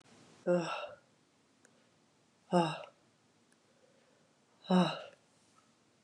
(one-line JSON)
{"exhalation_length": "6.0 s", "exhalation_amplitude": 5395, "exhalation_signal_mean_std_ratio": 0.31, "survey_phase": "beta (2021-08-13 to 2022-03-07)", "age": "45-64", "gender": "Female", "wearing_mask": "No", "symptom_cough_any": true, "symptom_new_continuous_cough": true, "symptom_runny_or_blocked_nose": true, "symptom_sore_throat": true, "symptom_abdominal_pain": true, "symptom_fatigue": true, "symptom_fever_high_temperature": true, "symptom_headache": true, "symptom_change_to_sense_of_smell_or_taste": true, "symptom_onset": "2 days", "smoker_status": "Never smoked", "respiratory_condition_asthma": false, "respiratory_condition_other": false, "recruitment_source": "Test and Trace", "submission_delay": "1 day", "covid_test_result": "Positive", "covid_test_method": "RT-qPCR", "covid_ct_value": 14.8, "covid_ct_gene": "ORF1ab gene", "covid_ct_mean": 15.0, "covid_viral_load": "12000000 copies/ml", "covid_viral_load_category": "High viral load (>1M copies/ml)"}